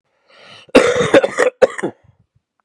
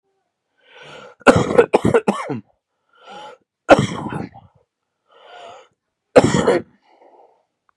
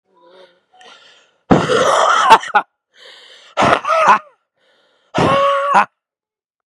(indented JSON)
{
  "cough_length": "2.6 s",
  "cough_amplitude": 32768,
  "cough_signal_mean_std_ratio": 0.41,
  "three_cough_length": "7.8 s",
  "three_cough_amplitude": 32768,
  "three_cough_signal_mean_std_ratio": 0.32,
  "exhalation_length": "6.7 s",
  "exhalation_amplitude": 32768,
  "exhalation_signal_mean_std_ratio": 0.48,
  "survey_phase": "beta (2021-08-13 to 2022-03-07)",
  "age": "18-44",
  "gender": "Male",
  "wearing_mask": "No",
  "symptom_cough_any": true,
  "symptom_new_continuous_cough": true,
  "symptom_runny_or_blocked_nose": true,
  "symptom_shortness_of_breath": true,
  "symptom_sore_throat": true,
  "symptom_abdominal_pain": true,
  "symptom_diarrhoea": true,
  "symptom_fatigue": true,
  "symptom_fever_high_temperature": true,
  "symptom_headache": true,
  "symptom_change_to_sense_of_smell_or_taste": true,
  "symptom_loss_of_taste": true,
  "symptom_onset": "3 days",
  "smoker_status": "Current smoker (e-cigarettes or vapes only)",
  "respiratory_condition_asthma": false,
  "respiratory_condition_other": false,
  "recruitment_source": "Test and Trace",
  "submission_delay": "2 days",
  "covid_test_result": "Positive",
  "covid_test_method": "RT-qPCR"
}